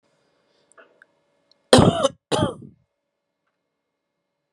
{
  "cough_length": "4.5 s",
  "cough_amplitude": 32768,
  "cough_signal_mean_std_ratio": 0.24,
  "survey_phase": "beta (2021-08-13 to 2022-03-07)",
  "age": "18-44",
  "gender": "Female",
  "wearing_mask": "No",
  "symptom_cough_any": true,
  "symptom_shortness_of_breath": true,
  "symptom_sore_throat": true,
  "symptom_abdominal_pain": true,
  "symptom_fatigue": true,
  "symptom_fever_high_temperature": true,
  "symptom_headache": true,
  "symptom_change_to_sense_of_smell_or_taste": true,
  "symptom_other": true,
  "symptom_onset": "2 days",
  "smoker_status": "Current smoker (1 to 10 cigarettes per day)",
  "respiratory_condition_asthma": false,
  "respiratory_condition_other": false,
  "recruitment_source": "Test and Trace",
  "submission_delay": "1 day",
  "covid_test_result": "Positive",
  "covid_test_method": "RT-qPCR",
  "covid_ct_value": 15.7,
  "covid_ct_gene": "ORF1ab gene"
}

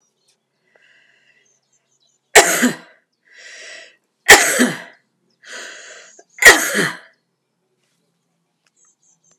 {
  "three_cough_length": "9.4 s",
  "three_cough_amplitude": 32768,
  "three_cough_signal_mean_std_ratio": 0.27,
  "survey_phase": "alpha (2021-03-01 to 2021-08-12)",
  "age": "45-64",
  "gender": "Female",
  "wearing_mask": "No",
  "symptom_shortness_of_breath": true,
  "symptom_headache": true,
  "symptom_onset": "12 days",
  "smoker_status": "Ex-smoker",
  "respiratory_condition_asthma": false,
  "respiratory_condition_other": false,
  "recruitment_source": "REACT",
  "submission_delay": "2 days",
  "covid_test_result": "Negative",
  "covid_test_method": "RT-qPCR"
}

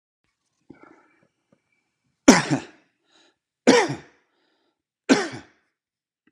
{
  "three_cough_length": "6.3 s",
  "three_cough_amplitude": 32767,
  "three_cough_signal_mean_std_ratio": 0.23,
  "survey_phase": "alpha (2021-03-01 to 2021-08-12)",
  "age": "45-64",
  "gender": "Male",
  "wearing_mask": "No",
  "symptom_none": true,
  "smoker_status": "Never smoked",
  "respiratory_condition_asthma": false,
  "respiratory_condition_other": false,
  "recruitment_source": "REACT",
  "submission_delay": "3 days",
  "covid_test_result": "Negative",
  "covid_test_method": "RT-qPCR"
}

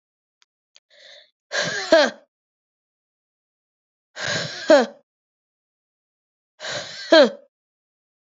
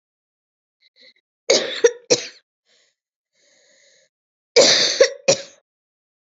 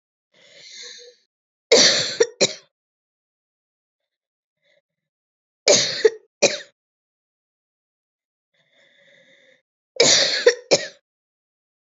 {
  "exhalation_length": "8.4 s",
  "exhalation_amplitude": 28736,
  "exhalation_signal_mean_std_ratio": 0.27,
  "cough_length": "6.3 s",
  "cough_amplitude": 31292,
  "cough_signal_mean_std_ratio": 0.3,
  "three_cough_length": "11.9 s",
  "three_cough_amplitude": 32163,
  "three_cough_signal_mean_std_ratio": 0.28,
  "survey_phase": "beta (2021-08-13 to 2022-03-07)",
  "age": "18-44",
  "gender": "Female",
  "wearing_mask": "No",
  "symptom_cough_any": true,
  "symptom_runny_or_blocked_nose": true,
  "symptom_fatigue": true,
  "symptom_fever_high_temperature": true,
  "symptom_headache": true,
  "symptom_change_to_sense_of_smell_or_taste": true,
  "symptom_onset": "4 days",
  "smoker_status": "Current smoker (1 to 10 cigarettes per day)",
  "respiratory_condition_asthma": false,
  "respiratory_condition_other": false,
  "recruitment_source": "Test and Trace",
  "submission_delay": "1 day",
  "covid_test_result": "Positive",
  "covid_test_method": "RT-qPCR",
  "covid_ct_value": 16.0,
  "covid_ct_gene": "N gene"
}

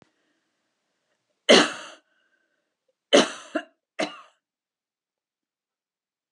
{
  "cough_length": "6.3 s",
  "cough_amplitude": 27493,
  "cough_signal_mean_std_ratio": 0.21,
  "survey_phase": "alpha (2021-03-01 to 2021-08-12)",
  "age": "65+",
  "gender": "Female",
  "wearing_mask": "No",
  "symptom_none": true,
  "smoker_status": "Never smoked",
  "respiratory_condition_asthma": false,
  "respiratory_condition_other": false,
  "recruitment_source": "REACT",
  "submission_delay": "1 day",
  "covid_test_result": "Negative",
  "covid_test_method": "RT-qPCR"
}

